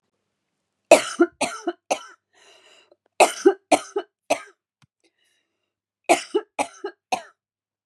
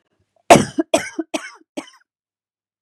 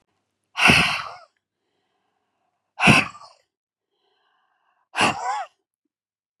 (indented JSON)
{
  "three_cough_length": "7.9 s",
  "three_cough_amplitude": 32768,
  "three_cough_signal_mean_std_ratio": 0.26,
  "cough_length": "2.8 s",
  "cough_amplitude": 32768,
  "cough_signal_mean_std_ratio": 0.25,
  "exhalation_length": "6.4 s",
  "exhalation_amplitude": 31594,
  "exhalation_signal_mean_std_ratio": 0.31,
  "survey_phase": "beta (2021-08-13 to 2022-03-07)",
  "age": "45-64",
  "gender": "Female",
  "wearing_mask": "No",
  "symptom_fatigue": true,
  "smoker_status": "Never smoked",
  "respiratory_condition_asthma": false,
  "respiratory_condition_other": false,
  "recruitment_source": "REACT",
  "submission_delay": "3 days",
  "covid_test_result": "Negative",
  "covid_test_method": "RT-qPCR",
  "influenza_a_test_result": "Unknown/Void",
  "influenza_b_test_result": "Unknown/Void"
}